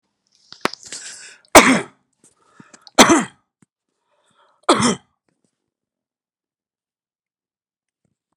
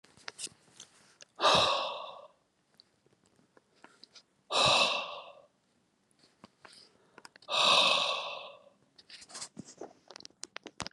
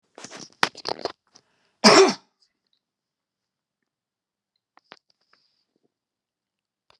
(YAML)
three_cough_length: 8.4 s
three_cough_amplitude: 32768
three_cough_signal_mean_std_ratio: 0.23
exhalation_length: 10.9 s
exhalation_amplitude: 8577
exhalation_signal_mean_std_ratio: 0.37
cough_length: 7.0 s
cough_amplitude: 32768
cough_signal_mean_std_ratio: 0.18
survey_phase: beta (2021-08-13 to 2022-03-07)
age: 45-64
gender: Male
wearing_mask: 'No'
symptom_none: true
smoker_status: Ex-smoker
respiratory_condition_asthma: false
respiratory_condition_other: false
recruitment_source: REACT
submission_delay: 4 days
covid_test_result: Negative
covid_test_method: RT-qPCR